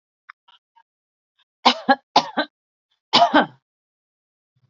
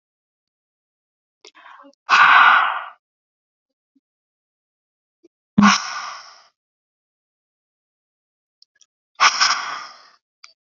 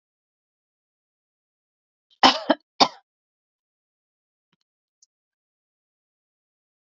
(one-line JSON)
{"three_cough_length": "4.7 s", "three_cough_amplitude": 28241, "three_cough_signal_mean_std_ratio": 0.27, "exhalation_length": "10.7 s", "exhalation_amplitude": 31711, "exhalation_signal_mean_std_ratio": 0.29, "cough_length": "7.0 s", "cough_amplitude": 30908, "cough_signal_mean_std_ratio": 0.13, "survey_phase": "beta (2021-08-13 to 2022-03-07)", "age": "18-44", "gender": "Female", "wearing_mask": "No", "symptom_none": true, "smoker_status": "Ex-smoker", "respiratory_condition_asthma": false, "respiratory_condition_other": false, "recruitment_source": "Test and Trace", "submission_delay": "0 days", "covid_test_result": "Negative", "covid_test_method": "LFT"}